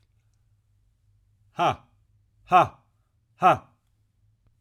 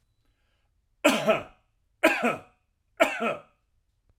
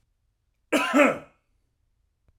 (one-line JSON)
{"exhalation_length": "4.6 s", "exhalation_amplitude": 19692, "exhalation_signal_mean_std_ratio": 0.24, "three_cough_length": "4.2 s", "three_cough_amplitude": 16566, "three_cough_signal_mean_std_ratio": 0.36, "cough_length": "2.4 s", "cough_amplitude": 17189, "cough_signal_mean_std_ratio": 0.33, "survey_phase": "alpha (2021-03-01 to 2021-08-12)", "age": "45-64", "gender": "Male", "wearing_mask": "No", "symptom_none": true, "smoker_status": "Never smoked", "respiratory_condition_asthma": false, "respiratory_condition_other": false, "recruitment_source": "REACT", "submission_delay": "1 day", "covid_test_result": "Negative", "covid_test_method": "RT-qPCR"}